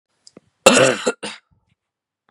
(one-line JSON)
{"cough_length": "2.3 s", "cough_amplitude": 32768, "cough_signal_mean_std_ratio": 0.32, "survey_phase": "beta (2021-08-13 to 2022-03-07)", "age": "45-64", "gender": "Female", "wearing_mask": "No", "symptom_none": true, "symptom_onset": "12 days", "smoker_status": "Ex-smoker", "respiratory_condition_asthma": false, "respiratory_condition_other": false, "recruitment_source": "REACT", "submission_delay": "3 days", "covid_test_result": "Positive", "covid_test_method": "RT-qPCR", "covid_ct_value": 24.8, "covid_ct_gene": "E gene", "influenza_a_test_result": "Negative", "influenza_b_test_result": "Negative"}